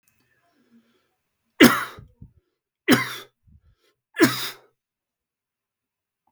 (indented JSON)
{
  "three_cough_length": "6.3 s",
  "three_cough_amplitude": 32768,
  "three_cough_signal_mean_std_ratio": 0.23,
  "survey_phase": "beta (2021-08-13 to 2022-03-07)",
  "age": "65+",
  "gender": "Male",
  "wearing_mask": "No",
  "symptom_none": true,
  "smoker_status": "Never smoked",
  "respiratory_condition_asthma": false,
  "respiratory_condition_other": false,
  "recruitment_source": "REACT",
  "submission_delay": "4 days",
  "covid_test_result": "Negative",
  "covid_test_method": "RT-qPCR"
}